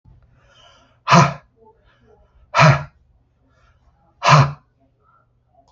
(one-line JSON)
{"exhalation_length": "5.7 s", "exhalation_amplitude": 32768, "exhalation_signal_mean_std_ratio": 0.29, "survey_phase": "beta (2021-08-13 to 2022-03-07)", "age": "65+", "gender": "Male", "wearing_mask": "No", "symptom_runny_or_blocked_nose": true, "smoker_status": "Never smoked", "respiratory_condition_asthma": false, "respiratory_condition_other": false, "recruitment_source": "REACT", "submission_delay": "2 days", "covid_test_result": "Negative", "covid_test_method": "RT-qPCR", "influenza_a_test_result": "Negative", "influenza_b_test_result": "Negative"}